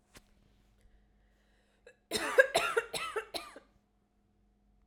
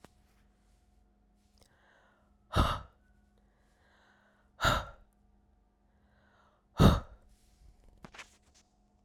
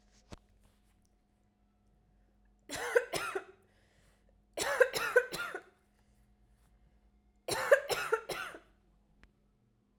{
  "cough_length": "4.9 s",
  "cough_amplitude": 13742,
  "cough_signal_mean_std_ratio": 0.29,
  "exhalation_length": "9.0 s",
  "exhalation_amplitude": 12540,
  "exhalation_signal_mean_std_ratio": 0.22,
  "three_cough_length": "10.0 s",
  "three_cough_amplitude": 9898,
  "three_cough_signal_mean_std_ratio": 0.31,
  "survey_phase": "alpha (2021-03-01 to 2021-08-12)",
  "age": "18-44",
  "gender": "Female",
  "wearing_mask": "No",
  "symptom_none": true,
  "symptom_onset": "4 days",
  "smoker_status": "Never smoked",
  "respiratory_condition_asthma": false,
  "respiratory_condition_other": false,
  "recruitment_source": "REACT",
  "submission_delay": "3 days",
  "covid_test_result": "Negative",
  "covid_test_method": "RT-qPCR"
}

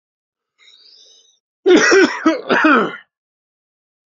{
  "cough_length": "4.2 s",
  "cough_amplitude": 29829,
  "cough_signal_mean_std_ratio": 0.42,
  "survey_phase": "beta (2021-08-13 to 2022-03-07)",
  "age": "45-64",
  "gender": "Male",
  "wearing_mask": "No",
  "symptom_none": true,
  "smoker_status": "Ex-smoker",
  "respiratory_condition_asthma": false,
  "respiratory_condition_other": false,
  "recruitment_source": "REACT",
  "submission_delay": "2 days",
  "covid_test_result": "Negative",
  "covid_test_method": "RT-qPCR",
  "influenza_a_test_result": "Unknown/Void",
  "influenza_b_test_result": "Unknown/Void"
}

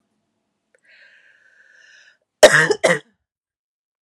{
  "cough_length": "4.0 s",
  "cough_amplitude": 32768,
  "cough_signal_mean_std_ratio": 0.23,
  "survey_phase": "beta (2021-08-13 to 2022-03-07)",
  "age": "45-64",
  "gender": "Female",
  "wearing_mask": "No",
  "symptom_runny_or_blocked_nose": true,
  "symptom_onset": "3 days",
  "smoker_status": "Never smoked",
  "respiratory_condition_asthma": false,
  "respiratory_condition_other": false,
  "recruitment_source": "Test and Trace",
  "submission_delay": "2 days",
  "covid_test_result": "Positive",
  "covid_test_method": "ePCR"
}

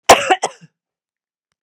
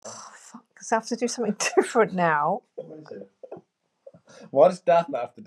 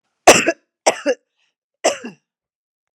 {
  "cough_length": "1.6 s",
  "cough_amplitude": 32768,
  "cough_signal_mean_std_ratio": 0.28,
  "exhalation_length": "5.5 s",
  "exhalation_amplitude": 18405,
  "exhalation_signal_mean_std_ratio": 0.47,
  "three_cough_length": "3.0 s",
  "three_cough_amplitude": 32768,
  "three_cough_signal_mean_std_ratio": 0.29,
  "survey_phase": "beta (2021-08-13 to 2022-03-07)",
  "age": "45-64",
  "gender": "Female",
  "wearing_mask": "No",
  "symptom_none": true,
  "smoker_status": "Never smoked",
  "respiratory_condition_asthma": false,
  "respiratory_condition_other": false,
  "recruitment_source": "REACT",
  "submission_delay": "1 day",
  "covid_test_result": "Negative",
  "covid_test_method": "RT-qPCR"
}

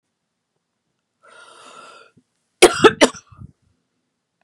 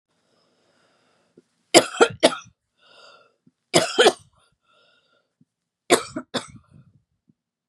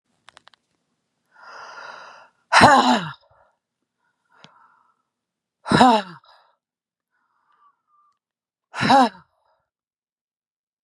{
  "cough_length": "4.4 s",
  "cough_amplitude": 32768,
  "cough_signal_mean_std_ratio": 0.2,
  "three_cough_length": "7.7 s",
  "three_cough_amplitude": 32768,
  "three_cough_signal_mean_std_ratio": 0.23,
  "exhalation_length": "10.8 s",
  "exhalation_amplitude": 32767,
  "exhalation_signal_mean_std_ratio": 0.26,
  "survey_phase": "beta (2021-08-13 to 2022-03-07)",
  "age": "45-64",
  "gender": "Female",
  "wearing_mask": "No",
  "symptom_none": true,
  "smoker_status": "Ex-smoker",
  "respiratory_condition_asthma": false,
  "respiratory_condition_other": false,
  "recruitment_source": "REACT",
  "submission_delay": "1 day",
  "covid_test_result": "Negative",
  "covid_test_method": "RT-qPCR",
  "influenza_a_test_result": "Negative",
  "influenza_b_test_result": "Negative"
}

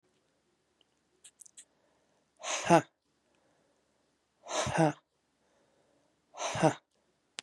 {
  "exhalation_length": "7.4 s",
  "exhalation_amplitude": 12094,
  "exhalation_signal_mean_std_ratio": 0.24,
  "survey_phase": "beta (2021-08-13 to 2022-03-07)",
  "age": "45-64",
  "gender": "Female",
  "wearing_mask": "No",
  "symptom_cough_any": true,
  "symptom_runny_or_blocked_nose": true,
  "symptom_fatigue": true,
  "symptom_fever_high_temperature": true,
  "symptom_headache": true,
  "symptom_change_to_sense_of_smell_or_taste": true,
  "symptom_onset": "4 days",
  "smoker_status": "Never smoked",
  "respiratory_condition_asthma": false,
  "respiratory_condition_other": false,
  "recruitment_source": "Test and Trace",
  "submission_delay": "2 days",
  "covid_test_result": "Positive",
  "covid_test_method": "RT-qPCR",
  "covid_ct_value": 15.4,
  "covid_ct_gene": "ORF1ab gene",
  "covid_ct_mean": 15.7,
  "covid_viral_load": "7200000 copies/ml",
  "covid_viral_load_category": "High viral load (>1M copies/ml)"
}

